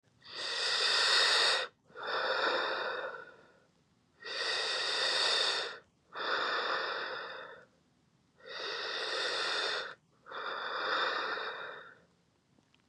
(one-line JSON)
{"exhalation_length": "12.9 s", "exhalation_amplitude": 6173, "exhalation_signal_mean_std_ratio": 0.72, "survey_phase": "beta (2021-08-13 to 2022-03-07)", "age": "18-44", "gender": "Male", "wearing_mask": "Yes", "symptom_none": true, "smoker_status": "Current smoker (e-cigarettes or vapes only)", "respiratory_condition_asthma": false, "respiratory_condition_other": false, "recruitment_source": "REACT", "submission_delay": "1 day", "covid_test_result": "Negative", "covid_test_method": "RT-qPCR", "influenza_a_test_result": "Negative", "influenza_b_test_result": "Negative"}